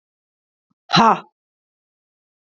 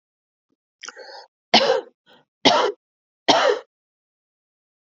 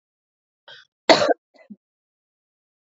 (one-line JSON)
{"exhalation_length": "2.5 s", "exhalation_amplitude": 27898, "exhalation_signal_mean_std_ratio": 0.24, "three_cough_length": "4.9 s", "three_cough_amplitude": 31511, "three_cough_signal_mean_std_ratio": 0.33, "cough_length": "2.8 s", "cough_amplitude": 32767, "cough_signal_mean_std_ratio": 0.21, "survey_phase": "beta (2021-08-13 to 2022-03-07)", "age": "45-64", "gender": "Female", "wearing_mask": "No", "symptom_none": true, "smoker_status": "Ex-smoker", "respiratory_condition_asthma": false, "respiratory_condition_other": true, "recruitment_source": "REACT", "submission_delay": "7 days", "covid_test_result": "Negative", "covid_test_method": "RT-qPCR", "influenza_a_test_result": "Negative", "influenza_b_test_result": "Negative"}